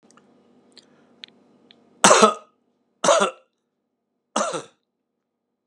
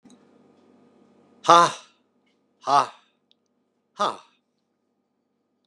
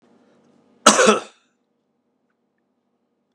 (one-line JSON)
{"three_cough_length": "5.7 s", "three_cough_amplitude": 32767, "three_cough_signal_mean_std_ratio": 0.27, "exhalation_length": "5.7 s", "exhalation_amplitude": 31858, "exhalation_signal_mean_std_ratio": 0.22, "cough_length": "3.3 s", "cough_amplitude": 32768, "cough_signal_mean_std_ratio": 0.24, "survey_phase": "alpha (2021-03-01 to 2021-08-12)", "age": "65+", "gender": "Male", "wearing_mask": "No", "symptom_cough_any": true, "symptom_fatigue": true, "symptom_fever_high_temperature": true, "symptom_headache": true, "symptom_change_to_sense_of_smell_or_taste": true, "symptom_loss_of_taste": true, "symptom_onset": "5 days", "smoker_status": "Never smoked", "respiratory_condition_asthma": false, "respiratory_condition_other": false, "recruitment_source": "Test and Trace", "submission_delay": "1 day", "covid_test_result": "Positive", "covid_test_method": "RT-qPCR"}